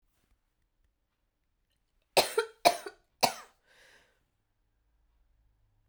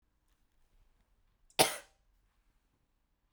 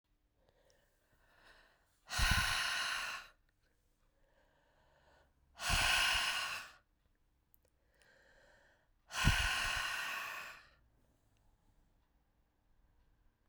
{"three_cough_length": "5.9 s", "three_cough_amplitude": 14967, "three_cough_signal_mean_std_ratio": 0.19, "cough_length": "3.3 s", "cough_amplitude": 11162, "cough_signal_mean_std_ratio": 0.16, "exhalation_length": "13.5 s", "exhalation_amplitude": 4592, "exhalation_signal_mean_std_ratio": 0.41, "survey_phase": "beta (2021-08-13 to 2022-03-07)", "age": "18-44", "gender": "Female", "wearing_mask": "No", "symptom_cough_any": true, "symptom_runny_or_blocked_nose": true, "symptom_fatigue": true, "symptom_change_to_sense_of_smell_or_taste": true, "smoker_status": "Never smoked", "respiratory_condition_asthma": false, "respiratory_condition_other": false, "recruitment_source": "Test and Trace", "submission_delay": "2 days", "covid_test_result": "Positive", "covid_test_method": "RT-qPCR", "covid_ct_value": 18.2, "covid_ct_gene": "ORF1ab gene", "covid_ct_mean": 18.8, "covid_viral_load": "680000 copies/ml", "covid_viral_load_category": "Low viral load (10K-1M copies/ml)"}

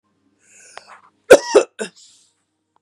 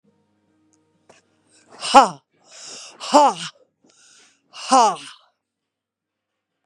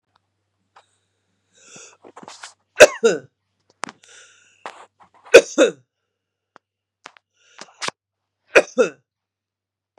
{"cough_length": "2.8 s", "cough_amplitude": 32768, "cough_signal_mean_std_ratio": 0.22, "exhalation_length": "6.7 s", "exhalation_amplitude": 32768, "exhalation_signal_mean_std_ratio": 0.26, "three_cough_length": "10.0 s", "three_cough_amplitude": 32768, "three_cough_signal_mean_std_ratio": 0.19, "survey_phase": "beta (2021-08-13 to 2022-03-07)", "age": "45-64", "gender": "Female", "wearing_mask": "No", "symptom_cough_any": true, "symptom_runny_or_blocked_nose": true, "symptom_fatigue": true, "symptom_headache": true, "symptom_other": true, "symptom_onset": "3 days", "smoker_status": "Ex-smoker", "respiratory_condition_asthma": false, "respiratory_condition_other": false, "recruitment_source": "Test and Trace", "submission_delay": "2 days", "covid_test_result": "Positive", "covid_test_method": "RT-qPCR", "covid_ct_value": 19.6, "covid_ct_gene": "ORF1ab gene"}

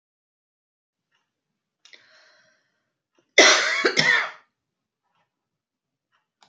{"cough_length": "6.5 s", "cough_amplitude": 29348, "cough_signal_mean_std_ratio": 0.26, "survey_phase": "beta (2021-08-13 to 2022-03-07)", "age": "45-64", "gender": "Female", "wearing_mask": "No", "symptom_cough_any": true, "symptom_fatigue": true, "symptom_change_to_sense_of_smell_or_taste": true, "symptom_other": true, "symptom_onset": "2 days", "smoker_status": "Never smoked", "respiratory_condition_asthma": false, "respiratory_condition_other": false, "recruitment_source": "Test and Trace", "submission_delay": "1 day", "covid_test_result": "Positive", "covid_test_method": "RT-qPCR", "covid_ct_value": 29.9, "covid_ct_gene": "ORF1ab gene"}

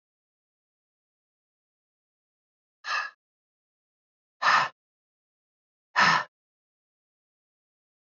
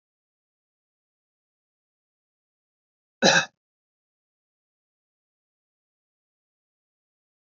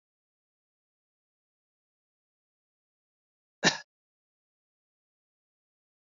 {"exhalation_length": "8.2 s", "exhalation_amplitude": 12980, "exhalation_signal_mean_std_ratio": 0.22, "cough_length": "7.5 s", "cough_amplitude": 21530, "cough_signal_mean_std_ratio": 0.13, "three_cough_length": "6.1 s", "three_cough_amplitude": 12307, "three_cough_signal_mean_std_ratio": 0.1, "survey_phase": "alpha (2021-03-01 to 2021-08-12)", "age": "45-64", "gender": "Male", "wearing_mask": "No", "symptom_none": true, "smoker_status": "Never smoked", "respiratory_condition_asthma": false, "respiratory_condition_other": false, "recruitment_source": "REACT", "submission_delay": "6 days", "covid_test_result": "Negative", "covid_test_method": "RT-qPCR"}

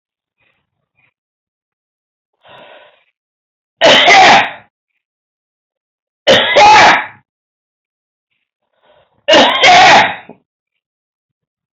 {"three_cough_length": "11.8 s", "three_cough_amplitude": 32768, "three_cough_signal_mean_std_ratio": 0.4, "survey_phase": "alpha (2021-03-01 to 2021-08-12)", "age": "45-64", "gender": "Male", "wearing_mask": "No", "symptom_none": true, "smoker_status": "Never smoked", "respiratory_condition_asthma": false, "respiratory_condition_other": false, "recruitment_source": "REACT", "submission_delay": "2 days", "covid_test_result": "Negative", "covid_test_method": "RT-qPCR"}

